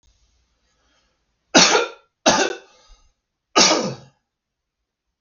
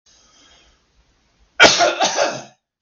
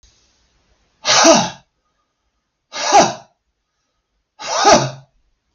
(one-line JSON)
{"three_cough_length": "5.2 s", "three_cough_amplitude": 32768, "three_cough_signal_mean_std_ratio": 0.33, "cough_length": "2.8 s", "cough_amplitude": 32768, "cough_signal_mean_std_ratio": 0.38, "exhalation_length": "5.5 s", "exhalation_amplitude": 32768, "exhalation_signal_mean_std_ratio": 0.36, "survey_phase": "beta (2021-08-13 to 2022-03-07)", "age": "45-64", "gender": "Male", "wearing_mask": "No", "symptom_none": true, "smoker_status": "Ex-smoker", "respiratory_condition_asthma": true, "respiratory_condition_other": false, "recruitment_source": "REACT", "submission_delay": "1 day", "covid_test_result": "Negative", "covid_test_method": "RT-qPCR", "influenza_a_test_result": "Unknown/Void", "influenza_b_test_result": "Unknown/Void"}